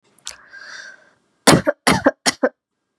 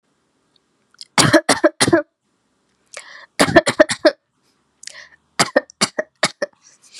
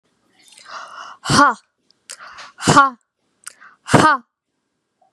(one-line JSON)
{"cough_length": "3.0 s", "cough_amplitude": 32768, "cough_signal_mean_std_ratio": 0.33, "three_cough_length": "7.0 s", "three_cough_amplitude": 32768, "three_cough_signal_mean_std_ratio": 0.32, "exhalation_length": "5.1 s", "exhalation_amplitude": 32768, "exhalation_signal_mean_std_ratio": 0.33, "survey_phase": "beta (2021-08-13 to 2022-03-07)", "age": "18-44", "gender": "Female", "wearing_mask": "No", "symptom_change_to_sense_of_smell_or_taste": true, "symptom_onset": "4 days", "smoker_status": "Never smoked", "respiratory_condition_asthma": false, "respiratory_condition_other": false, "recruitment_source": "Test and Trace", "submission_delay": "1 day", "covid_test_result": "Positive", "covid_test_method": "RT-qPCR"}